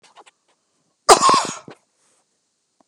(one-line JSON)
{"cough_length": "2.9 s", "cough_amplitude": 32768, "cough_signal_mean_std_ratio": 0.27, "survey_phase": "beta (2021-08-13 to 2022-03-07)", "age": "65+", "gender": "Male", "wearing_mask": "No", "symptom_none": true, "smoker_status": "Ex-smoker", "respiratory_condition_asthma": false, "respiratory_condition_other": false, "recruitment_source": "REACT", "submission_delay": "2 days", "covid_test_result": "Negative", "covid_test_method": "RT-qPCR", "influenza_a_test_result": "Negative", "influenza_b_test_result": "Negative"}